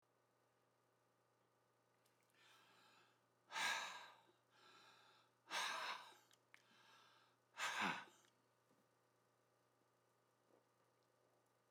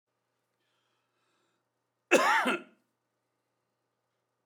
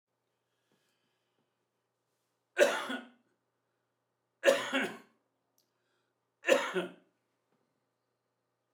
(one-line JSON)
{"exhalation_length": "11.7 s", "exhalation_amplitude": 1177, "exhalation_signal_mean_std_ratio": 0.33, "cough_length": "4.5 s", "cough_amplitude": 14840, "cough_signal_mean_std_ratio": 0.25, "three_cough_length": "8.7 s", "three_cough_amplitude": 10068, "three_cough_signal_mean_std_ratio": 0.25, "survey_phase": "beta (2021-08-13 to 2022-03-07)", "age": "65+", "gender": "Male", "wearing_mask": "No", "symptom_none": true, "smoker_status": "Ex-smoker", "respiratory_condition_asthma": false, "respiratory_condition_other": true, "recruitment_source": "REACT", "submission_delay": "2 days", "covid_test_result": "Negative", "covid_test_method": "RT-qPCR", "influenza_a_test_result": "Negative", "influenza_b_test_result": "Negative"}